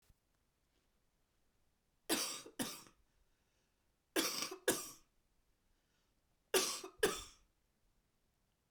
{"three_cough_length": "8.7 s", "three_cough_amplitude": 4497, "three_cough_signal_mean_std_ratio": 0.31, "survey_phase": "beta (2021-08-13 to 2022-03-07)", "age": "45-64", "gender": "Male", "wearing_mask": "No", "symptom_cough_any": true, "symptom_runny_or_blocked_nose": true, "symptom_fatigue": true, "symptom_headache": true, "symptom_change_to_sense_of_smell_or_taste": true, "symptom_loss_of_taste": true, "smoker_status": "Never smoked", "respiratory_condition_asthma": false, "respiratory_condition_other": false, "recruitment_source": "Test and Trace", "submission_delay": "2 days", "covid_test_result": "Positive", "covid_test_method": "RT-qPCR", "covid_ct_value": 17.1, "covid_ct_gene": "ORF1ab gene", "covid_ct_mean": 18.2, "covid_viral_load": "1100000 copies/ml", "covid_viral_load_category": "High viral load (>1M copies/ml)"}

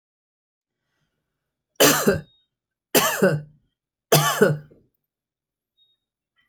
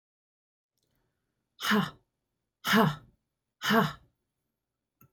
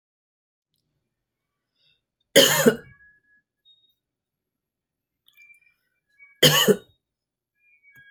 {"three_cough_length": "6.5 s", "three_cough_amplitude": 25486, "three_cough_signal_mean_std_ratio": 0.34, "exhalation_length": "5.1 s", "exhalation_amplitude": 11828, "exhalation_signal_mean_std_ratio": 0.31, "cough_length": "8.1 s", "cough_amplitude": 30100, "cough_signal_mean_std_ratio": 0.23, "survey_phase": "beta (2021-08-13 to 2022-03-07)", "age": "65+", "gender": "Female", "wearing_mask": "No", "symptom_none": true, "smoker_status": "Ex-smoker", "respiratory_condition_asthma": false, "respiratory_condition_other": false, "recruitment_source": "REACT", "submission_delay": "1 day", "covid_test_result": "Negative", "covid_test_method": "RT-qPCR"}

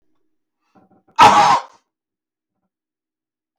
{"cough_length": "3.6 s", "cough_amplitude": 32768, "cough_signal_mean_std_ratio": 0.29, "survey_phase": "beta (2021-08-13 to 2022-03-07)", "age": "65+", "gender": "Male", "wearing_mask": "No", "symptom_none": true, "smoker_status": "Never smoked", "respiratory_condition_asthma": false, "respiratory_condition_other": false, "recruitment_source": "Test and Trace", "submission_delay": "0 days", "covid_test_result": "Negative", "covid_test_method": "LFT"}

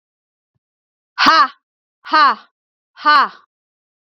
{"exhalation_length": "4.1 s", "exhalation_amplitude": 29795, "exhalation_signal_mean_std_ratio": 0.36, "survey_phase": "beta (2021-08-13 to 2022-03-07)", "age": "45-64", "gender": "Female", "wearing_mask": "No", "symptom_none": true, "smoker_status": "Ex-smoker", "respiratory_condition_asthma": true, "respiratory_condition_other": false, "recruitment_source": "REACT", "submission_delay": "3 days", "covid_test_result": "Negative", "covid_test_method": "RT-qPCR", "influenza_a_test_result": "Negative", "influenza_b_test_result": "Negative"}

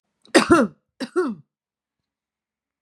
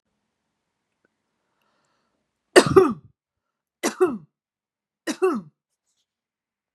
{"cough_length": "2.8 s", "cough_amplitude": 30154, "cough_signal_mean_std_ratio": 0.32, "three_cough_length": "6.7 s", "three_cough_amplitude": 32236, "three_cough_signal_mean_std_ratio": 0.23, "survey_phase": "beta (2021-08-13 to 2022-03-07)", "age": "45-64", "gender": "Female", "wearing_mask": "No", "symptom_none": true, "smoker_status": "Never smoked", "respiratory_condition_asthma": false, "respiratory_condition_other": false, "recruitment_source": "REACT", "submission_delay": "1 day", "covid_test_result": "Negative", "covid_test_method": "RT-qPCR", "influenza_a_test_result": "Unknown/Void", "influenza_b_test_result": "Unknown/Void"}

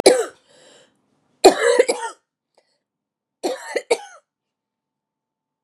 {"three_cough_length": "5.6 s", "three_cough_amplitude": 32768, "three_cough_signal_mean_std_ratio": 0.29, "survey_phase": "beta (2021-08-13 to 2022-03-07)", "age": "45-64", "gender": "Female", "wearing_mask": "No", "symptom_cough_any": true, "symptom_new_continuous_cough": true, "symptom_runny_or_blocked_nose": true, "symptom_shortness_of_breath": true, "symptom_sore_throat": true, "symptom_fatigue": true, "symptom_fever_high_temperature": true, "symptom_headache": true, "symptom_change_to_sense_of_smell_or_taste": true, "symptom_onset": "4 days", "smoker_status": "Ex-smoker", "respiratory_condition_asthma": false, "respiratory_condition_other": false, "recruitment_source": "Test and Trace", "submission_delay": "1 day", "covid_test_result": "Positive", "covid_test_method": "RT-qPCR", "covid_ct_value": 12.1, "covid_ct_gene": "ORF1ab gene"}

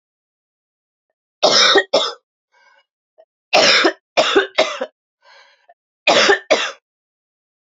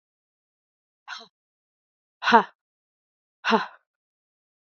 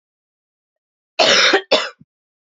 {"three_cough_length": "7.7 s", "three_cough_amplitude": 32768, "three_cough_signal_mean_std_ratio": 0.4, "exhalation_length": "4.8 s", "exhalation_amplitude": 26787, "exhalation_signal_mean_std_ratio": 0.2, "cough_length": "2.6 s", "cough_amplitude": 29259, "cough_signal_mean_std_ratio": 0.38, "survey_phase": "beta (2021-08-13 to 2022-03-07)", "age": "18-44", "gender": "Female", "wearing_mask": "No", "symptom_cough_any": true, "symptom_runny_or_blocked_nose": true, "symptom_diarrhoea": true, "symptom_fatigue": true, "symptom_headache": true, "smoker_status": "Never smoked", "respiratory_condition_asthma": false, "respiratory_condition_other": false, "recruitment_source": "Test and Trace", "submission_delay": "2 days", "covid_test_result": "Positive", "covid_test_method": "RT-qPCR", "covid_ct_value": 19.0, "covid_ct_gene": "ORF1ab gene", "covid_ct_mean": 19.4, "covid_viral_load": "420000 copies/ml", "covid_viral_load_category": "Low viral load (10K-1M copies/ml)"}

